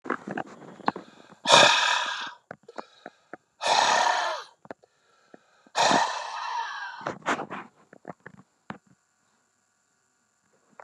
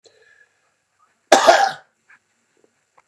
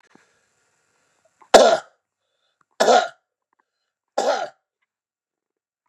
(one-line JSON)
{"exhalation_length": "10.8 s", "exhalation_amplitude": 30546, "exhalation_signal_mean_std_ratio": 0.4, "cough_length": "3.1 s", "cough_amplitude": 32768, "cough_signal_mean_std_ratio": 0.27, "three_cough_length": "5.9 s", "three_cough_amplitude": 32768, "three_cough_signal_mean_std_ratio": 0.26, "survey_phase": "beta (2021-08-13 to 2022-03-07)", "age": "45-64", "gender": "Male", "wearing_mask": "No", "symptom_none": true, "smoker_status": "Ex-smoker", "respiratory_condition_asthma": false, "respiratory_condition_other": false, "recruitment_source": "REACT", "submission_delay": "1 day", "covid_test_result": "Negative", "covid_test_method": "RT-qPCR", "influenza_a_test_result": "Negative", "influenza_b_test_result": "Negative"}